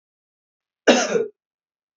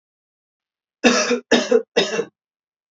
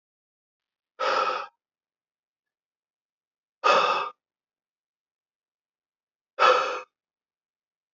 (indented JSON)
{
  "cough_length": "2.0 s",
  "cough_amplitude": 31837,
  "cough_signal_mean_std_ratio": 0.31,
  "three_cough_length": "2.9 s",
  "three_cough_amplitude": 31154,
  "three_cough_signal_mean_std_ratio": 0.42,
  "exhalation_length": "7.9 s",
  "exhalation_amplitude": 17678,
  "exhalation_signal_mean_std_ratio": 0.3,
  "survey_phase": "beta (2021-08-13 to 2022-03-07)",
  "age": "18-44",
  "gender": "Male",
  "wearing_mask": "No",
  "symptom_runny_or_blocked_nose": true,
  "smoker_status": "Never smoked",
  "respiratory_condition_asthma": true,
  "respiratory_condition_other": false,
  "recruitment_source": "REACT",
  "submission_delay": "2 days",
  "covid_test_result": "Negative",
  "covid_test_method": "RT-qPCR",
  "influenza_a_test_result": "Negative",
  "influenza_b_test_result": "Negative"
}